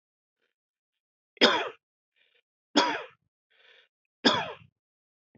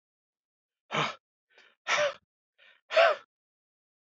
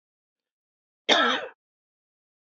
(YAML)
three_cough_length: 5.4 s
three_cough_amplitude: 14858
three_cough_signal_mean_std_ratio: 0.27
exhalation_length: 4.1 s
exhalation_amplitude: 10975
exhalation_signal_mean_std_ratio: 0.31
cough_length: 2.6 s
cough_amplitude: 20319
cough_signal_mean_std_ratio: 0.28
survey_phase: beta (2021-08-13 to 2022-03-07)
age: 65+
gender: Male
wearing_mask: 'No'
symptom_none: true
smoker_status: Ex-smoker
respiratory_condition_asthma: false
respiratory_condition_other: false
recruitment_source: REACT
submission_delay: 1 day
covid_test_result: Negative
covid_test_method: RT-qPCR
influenza_a_test_result: Unknown/Void
influenza_b_test_result: Unknown/Void